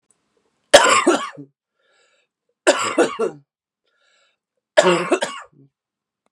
{
  "three_cough_length": "6.3 s",
  "three_cough_amplitude": 32768,
  "three_cough_signal_mean_std_ratio": 0.35,
  "survey_phase": "beta (2021-08-13 to 2022-03-07)",
  "age": "18-44",
  "gender": "Female",
  "wearing_mask": "No",
  "symptom_cough_any": true,
  "symptom_onset": "9 days",
  "smoker_status": "Ex-smoker",
  "respiratory_condition_asthma": false,
  "respiratory_condition_other": false,
  "recruitment_source": "REACT",
  "submission_delay": "3 days",
  "covid_test_result": "Negative",
  "covid_test_method": "RT-qPCR",
  "influenza_a_test_result": "Unknown/Void",
  "influenza_b_test_result": "Unknown/Void"
}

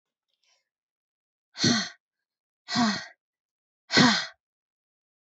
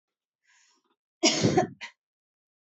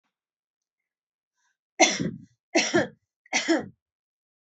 {
  "exhalation_length": "5.2 s",
  "exhalation_amplitude": 16918,
  "exhalation_signal_mean_std_ratio": 0.31,
  "cough_length": "2.6 s",
  "cough_amplitude": 14267,
  "cough_signal_mean_std_ratio": 0.32,
  "three_cough_length": "4.4 s",
  "three_cough_amplitude": 20826,
  "three_cough_signal_mean_std_ratio": 0.33,
  "survey_phase": "beta (2021-08-13 to 2022-03-07)",
  "age": "18-44",
  "gender": "Female",
  "wearing_mask": "No",
  "symptom_runny_or_blocked_nose": true,
  "smoker_status": "Ex-smoker",
  "respiratory_condition_asthma": false,
  "respiratory_condition_other": false,
  "recruitment_source": "REACT",
  "submission_delay": "4 days",
  "covid_test_result": "Negative",
  "covid_test_method": "RT-qPCR",
  "influenza_a_test_result": "Negative",
  "influenza_b_test_result": "Negative"
}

